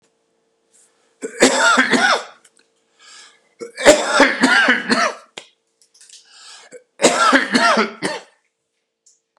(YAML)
three_cough_length: 9.4 s
three_cough_amplitude: 32768
three_cough_signal_mean_std_ratio: 0.46
survey_phase: beta (2021-08-13 to 2022-03-07)
age: 45-64
gender: Male
wearing_mask: 'No'
symptom_cough_any: true
symptom_runny_or_blocked_nose: true
symptom_sore_throat: true
symptom_diarrhoea: true
symptom_fatigue: true
symptom_fever_high_temperature: true
symptom_other: true
smoker_status: Ex-smoker
respiratory_condition_asthma: false
respiratory_condition_other: false
recruitment_source: Test and Trace
submission_delay: -1 day
covid_test_result: Positive
covid_test_method: LFT